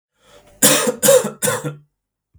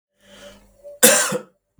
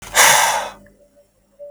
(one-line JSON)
{"three_cough_length": "2.4 s", "three_cough_amplitude": 32768, "three_cough_signal_mean_std_ratio": 0.46, "cough_length": "1.8 s", "cough_amplitude": 32768, "cough_signal_mean_std_ratio": 0.35, "exhalation_length": "1.7 s", "exhalation_amplitude": 32768, "exhalation_signal_mean_std_ratio": 0.47, "survey_phase": "beta (2021-08-13 to 2022-03-07)", "age": "18-44", "gender": "Male", "wearing_mask": "No", "symptom_runny_or_blocked_nose": true, "symptom_headache": true, "symptom_onset": "3 days", "smoker_status": "Ex-smoker", "respiratory_condition_asthma": true, "respiratory_condition_other": false, "recruitment_source": "REACT", "submission_delay": "12 days", "covid_test_result": "Negative", "covid_test_method": "RT-qPCR", "influenza_a_test_result": "Negative", "influenza_b_test_result": "Negative"}